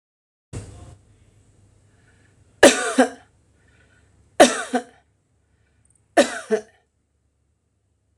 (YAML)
three_cough_length: 8.2 s
three_cough_amplitude: 26028
three_cough_signal_mean_std_ratio: 0.23
survey_phase: alpha (2021-03-01 to 2021-08-12)
age: 45-64
gender: Female
wearing_mask: 'No'
symptom_none: true
smoker_status: Never smoked
respiratory_condition_asthma: false
respiratory_condition_other: false
recruitment_source: REACT
submission_delay: 1 day
covid_test_result: Negative
covid_test_method: RT-qPCR